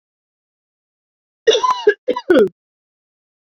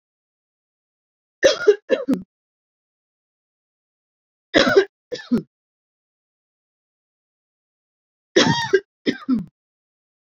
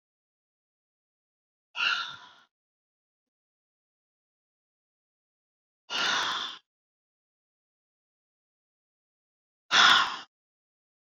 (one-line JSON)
{"cough_length": "3.4 s", "cough_amplitude": 27766, "cough_signal_mean_std_ratio": 0.34, "three_cough_length": "10.2 s", "three_cough_amplitude": 27551, "three_cough_signal_mean_std_ratio": 0.28, "exhalation_length": "11.0 s", "exhalation_amplitude": 14477, "exhalation_signal_mean_std_ratio": 0.24, "survey_phase": "beta (2021-08-13 to 2022-03-07)", "age": "18-44", "gender": "Female", "wearing_mask": "No", "symptom_fatigue": true, "symptom_onset": "4 days", "smoker_status": "Never smoked", "respiratory_condition_asthma": false, "respiratory_condition_other": false, "recruitment_source": "Test and Trace", "submission_delay": "2 days", "covid_test_result": "Positive", "covid_test_method": "RT-qPCR", "covid_ct_value": 20.9, "covid_ct_gene": "ORF1ab gene", "covid_ct_mean": 22.0, "covid_viral_load": "60000 copies/ml", "covid_viral_load_category": "Low viral load (10K-1M copies/ml)"}